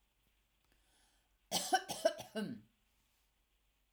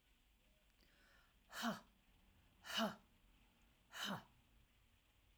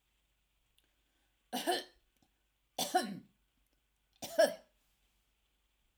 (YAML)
cough_length: 3.9 s
cough_amplitude: 3879
cough_signal_mean_std_ratio: 0.3
exhalation_length: 5.4 s
exhalation_amplitude: 1138
exhalation_signal_mean_std_ratio: 0.36
three_cough_length: 6.0 s
three_cough_amplitude: 4619
three_cough_signal_mean_std_ratio: 0.26
survey_phase: alpha (2021-03-01 to 2021-08-12)
age: 65+
gender: Female
wearing_mask: 'No'
symptom_none: true
smoker_status: Never smoked
respiratory_condition_asthma: false
respiratory_condition_other: false
recruitment_source: REACT
submission_delay: 1 day
covid_test_result: Negative
covid_test_method: RT-qPCR